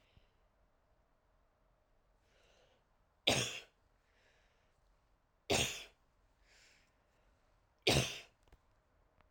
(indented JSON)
{
  "three_cough_length": "9.3 s",
  "three_cough_amplitude": 8020,
  "three_cough_signal_mean_std_ratio": 0.24,
  "survey_phase": "alpha (2021-03-01 to 2021-08-12)",
  "age": "18-44",
  "gender": "Female",
  "wearing_mask": "No",
  "symptom_cough_any": true,
  "symptom_fatigue": true,
  "symptom_headache": true,
  "symptom_loss_of_taste": true,
  "symptom_onset": "4 days",
  "smoker_status": "Never smoked",
  "respiratory_condition_asthma": false,
  "respiratory_condition_other": false,
  "recruitment_source": "Test and Trace",
  "submission_delay": "2 days",
  "covid_test_result": "Positive",
  "covid_test_method": "RT-qPCR"
}